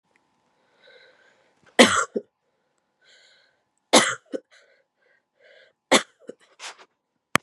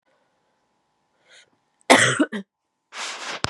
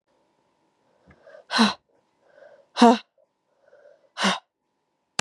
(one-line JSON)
{"three_cough_length": "7.4 s", "three_cough_amplitude": 32768, "three_cough_signal_mean_std_ratio": 0.21, "cough_length": "3.5 s", "cough_amplitude": 32368, "cough_signal_mean_std_ratio": 0.3, "exhalation_length": "5.2 s", "exhalation_amplitude": 27061, "exhalation_signal_mean_std_ratio": 0.24, "survey_phase": "beta (2021-08-13 to 2022-03-07)", "age": "18-44", "gender": "Female", "wearing_mask": "Yes", "symptom_cough_any": true, "symptom_shortness_of_breath": true, "symptom_fatigue": true, "symptom_fever_high_temperature": true, "symptom_headache": true, "symptom_loss_of_taste": true, "smoker_status": "Never smoked", "respiratory_condition_asthma": false, "respiratory_condition_other": false, "recruitment_source": "Test and Trace", "submission_delay": "2 days", "covid_test_result": "Positive", "covid_test_method": "RT-qPCR", "covid_ct_value": 11.8, "covid_ct_gene": "ORF1ab gene", "covid_ct_mean": 12.1, "covid_viral_load": "100000000 copies/ml", "covid_viral_load_category": "High viral load (>1M copies/ml)"}